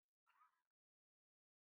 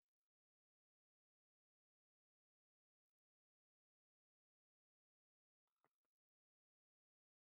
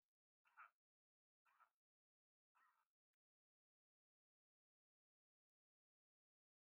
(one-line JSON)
{"cough_length": "1.8 s", "cough_amplitude": 21, "cough_signal_mean_std_ratio": 0.29, "exhalation_length": "7.4 s", "exhalation_amplitude": 21, "exhalation_signal_mean_std_ratio": 0.06, "three_cough_length": "6.7 s", "three_cough_amplitude": 64, "three_cough_signal_mean_std_ratio": 0.17, "survey_phase": "beta (2021-08-13 to 2022-03-07)", "age": "65+", "gender": "Male", "wearing_mask": "No", "symptom_none": true, "smoker_status": "Ex-smoker", "respiratory_condition_asthma": false, "respiratory_condition_other": false, "recruitment_source": "REACT", "submission_delay": "4 days", "covid_test_result": "Negative", "covid_test_method": "RT-qPCR", "influenza_a_test_result": "Negative", "influenza_b_test_result": "Negative"}